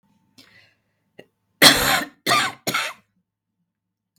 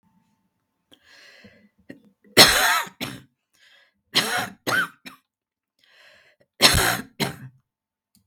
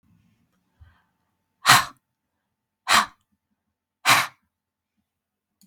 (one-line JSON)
{"cough_length": "4.2 s", "cough_amplitude": 32768, "cough_signal_mean_std_ratio": 0.32, "three_cough_length": "8.3 s", "three_cough_amplitude": 32768, "three_cough_signal_mean_std_ratio": 0.31, "exhalation_length": "5.7 s", "exhalation_amplitude": 32521, "exhalation_signal_mean_std_ratio": 0.23, "survey_phase": "beta (2021-08-13 to 2022-03-07)", "age": "65+", "gender": "Female", "wearing_mask": "No", "symptom_none": true, "symptom_onset": "8 days", "smoker_status": "Never smoked", "respiratory_condition_asthma": false, "respiratory_condition_other": true, "recruitment_source": "Test and Trace", "submission_delay": "2 days", "covid_test_result": "Negative", "covid_test_method": "RT-qPCR"}